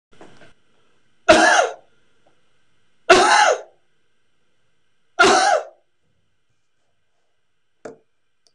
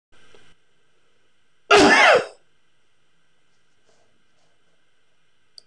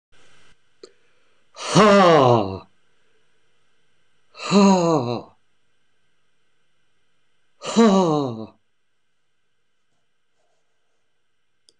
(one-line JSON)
{"three_cough_length": "8.5 s", "three_cough_amplitude": 26027, "three_cough_signal_mean_std_ratio": 0.34, "cough_length": "5.7 s", "cough_amplitude": 25971, "cough_signal_mean_std_ratio": 0.29, "exhalation_length": "11.8 s", "exhalation_amplitude": 25563, "exhalation_signal_mean_std_ratio": 0.34, "survey_phase": "beta (2021-08-13 to 2022-03-07)", "age": "65+", "gender": "Male", "wearing_mask": "No", "symptom_none": true, "smoker_status": "Never smoked", "respiratory_condition_asthma": false, "respiratory_condition_other": false, "recruitment_source": "REACT", "submission_delay": "2 days", "covid_test_result": "Negative", "covid_test_method": "RT-qPCR"}